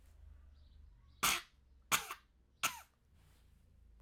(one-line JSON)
{"three_cough_length": "4.0 s", "three_cough_amplitude": 5805, "three_cough_signal_mean_std_ratio": 0.31, "survey_phase": "alpha (2021-03-01 to 2021-08-12)", "age": "45-64", "gender": "Female", "wearing_mask": "No", "symptom_fatigue": true, "smoker_status": "Never smoked", "respiratory_condition_asthma": false, "respiratory_condition_other": false, "recruitment_source": "Test and Trace", "submission_delay": "2 days", "covid_test_result": "Positive", "covid_test_method": "RT-qPCR", "covid_ct_value": 19.9, "covid_ct_gene": "ORF1ab gene", "covid_ct_mean": 20.8, "covid_viral_load": "150000 copies/ml", "covid_viral_load_category": "Low viral load (10K-1M copies/ml)"}